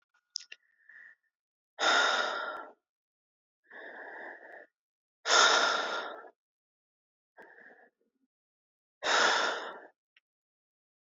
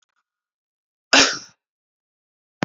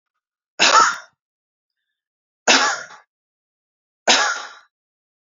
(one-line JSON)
{"exhalation_length": "11.1 s", "exhalation_amplitude": 11952, "exhalation_signal_mean_std_ratio": 0.37, "cough_length": "2.6 s", "cough_amplitude": 32767, "cough_signal_mean_std_ratio": 0.22, "three_cough_length": "5.3 s", "three_cough_amplitude": 31269, "three_cough_signal_mean_std_ratio": 0.34, "survey_phase": "beta (2021-08-13 to 2022-03-07)", "age": "18-44", "gender": "Male", "wearing_mask": "No", "symptom_none": true, "smoker_status": "Never smoked", "respiratory_condition_asthma": false, "respiratory_condition_other": false, "recruitment_source": "Test and Trace", "submission_delay": "0 days", "covid_test_result": "Negative", "covid_test_method": "LFT"}